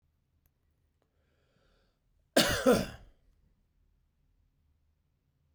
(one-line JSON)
{"cough_length": "5.5 s", "cough_amplitude": 9850, "cough_signal_mean_std_ratio": 0.23, "survey_phase": "beta (2021-08-13 to 2022-03-07)", "age": "45-64", "gender": "Male", "wearing_mask": "No", "symptom_fatigue": true, "symptom_headache": true, "smoker_status": "Never smoked", "respiratory_condition_asthma": false, "respiratory_condition_other": false, "recruitment_source": "REACT", "submission_delay": "2 days", "covid_test_result": "Negative", "covid_test_method": "RT-qPCR"}